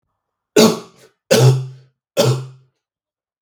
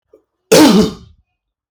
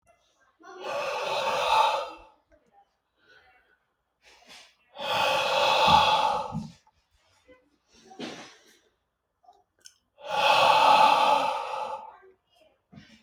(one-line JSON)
{"three_cough_length": "3.4 s", "three_cough_amplitude": 32768, "three_cough_signal_mean_std_ratio": 0.4, "cough_length": "1.7 s", "cough_amplitude": 32768, "cough_signal_mean_std_ratio": 0.43, "exhalation_length": "13.2 s", "exhalation_amplitude": 15876, "exhalation_signal_mean_std_ratio": 0.48, "survey_phase": "beta (2021-08-13 to 2022-03-07)", "age": "18-44", "gender": "Male", "wearing_mask": "No", "symptom_cough_any": true, "symptom_fatigue": true, "symptom_headache": true, "symptom_onset": "3 days", "smoker_status": "Ex-smoker", "respiratory_condition_asthma": false, "respiratory_condition_other": false, "recruitment_source": "Test and Trace", "submission_delay": "1 day", "covid_test_result": "Positive", "covid_test_method": "RT-qPCR", "covid_ct_value": 17.4, "covid_ct_gene": "N gene"}